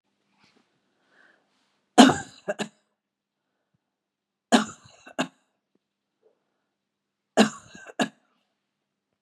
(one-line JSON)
{"three_cough_length": "9.2 s", "three_cough_amplitude": 32555, "three_cough_signal_mean_std_ratio": 0.18, "survey_phase": "beta (2021-08-13 to 2022-03-07)", "age": "65+", "gender": "Female", "wearing_mask": "No", "symptom_fatigue": true, "symptom_headache": true, "symptom_onset": "12 days", "smoker_status": "Ex-smoker", "respiratory_condition_asthma": false, "respiratory_condition_other": false, "recruitment_source": "REACT", "submission_delay": "2 days", "covid_test_result": "Negative", "covid_test_method": "RT-qPCR", "influenza_a_test_result": "Negative", "influenza_b_test_result": "Negative"}